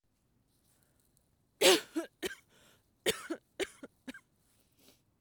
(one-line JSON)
{"cough_length": "5.2 s", "cough_amplitude": 10040, "cough_signal_mean_std_ratio": 0.24, "survey_phase": "beta (2021-08-13 to 2022-03-07)", "age": "18-44", "gender": "Female", "wearing_mask": "No", "symptom_none": true, "smoker_status": "Never smoked", "respiratory_condition_asthma": false, "respiratory_condition_other": false, "recruitment_source": "REACT", "submission_delay": "2 days", "covid_test_result": "Negative", "covid_test_method": "RT-qPCR"}